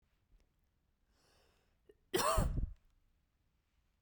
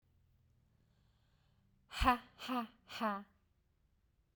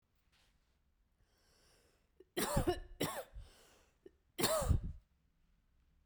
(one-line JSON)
{"cough_length": "4.0 s", "cough_amplitude": 3223, "cough_signal_mean_std_ratio": 0.32, "exhalation_length": "4.4 s", "exhalation_amplitude": 4506, "exhalation_signal_mean_std_ratio": 0.31, "three_cough_length": "6.1 s", "three_cough_amplitude": 3758, "three_cough_signal_mean_std_ratio": 0.36, "survey_phase": "beta (2021-08-13 to 2022-03-07)", "age": "18-44", "gender": "Female", "wearing_mask": "No", "symptom_fatigue": true, "smoker_status": "Never smoked", "respiratory_condition_asthma": false, "respiratory_condition_other": false, "recruitment_source": "REACT", "submission_delay": "1 day", "covid_test_result": "Negative", "covid_test_method": "RT-qPCR"}